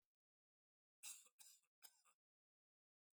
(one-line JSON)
{"three_cough_length": "3.2 s", "three_cough_amplitude": 351, "three_cough_signal_mean_std_ratio": 0.27, "survey_phase": "alpha (2021-03-01 to 2021-08-12)", "age": "65+", "gender": "Male", "wearing_mask": "No", "symptom_none": true, "smoker_status": "Never smoked", "respiratory_condition_asthma": false, "respiratory_condition_other": false, "recruitment_source": "REACT", "submission_delay": "2 days", "covid_test_result": "Negative", "covid_test_method": "RT-qPCR"}